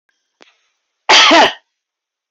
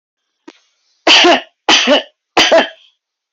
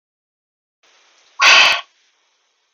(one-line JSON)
{"cough_length": "2.3 s", "cough_amplitude": 32768, "cough_signal_mean_std_ratio": 0.38, "three_cough_length": "3.3 s", "three_cough_amplitude": 32767, "three_cough_signal_mean_std_ratio": 0.47, "exhalation_length": "2.7 s", "exhalation_amplitude": 31511, "exhalation_signal_mean_std_ratio": 0.31, "survey_phase": "beta (2021-08-13 to 2022-03-07)", "age": "45-64", "gender": "Female", "wearing_mask": "No", "symptom_none": true, "symptom_onset": "11 days", "smoker_status": "Never smoked", "respiratory_condition_asthma": false, "respiratory_condition_other": false, "recruitment_source": "REACT", "submission_delay": "6 days", "covid_test_result": "Negative", "covid_test_method": "RT-qPCR"}